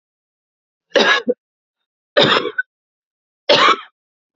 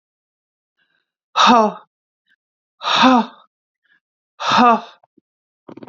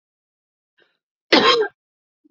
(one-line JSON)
{"three_cough_length": "4.4 s", "three_cough_amplitude": 31901, "three_cough_signal_mean_std_ratio": 0.37, "exhalation_length": "5.9 s", "exhalation_amplitude": 28087, "exhalation_signal_mean_std_ratio": 0.35, "cough_length": "2.3 s", "cough_amplitude": 29879, "cough_signal_mean_std_ratio": 0.31, "survey_phase": "beta (2021-08-13 to 2022-03-07)", "age": "45-64", "gender": "Female", "wearing_mask": "No", "symptom_none": true, "smoker_status": "Current smoker (11 or more cigarettes per day)", "respiratory_condition_asthma": false, "respiratory_condition_other": false, "recruitment_source": "REACT", "submission_delay": "1 day", "covid_test_result": "Negative", "covid_test_method": "RT-qPCR", "influenza_a_test_result": "Negative", "influenza_b_test_result": "Negative"}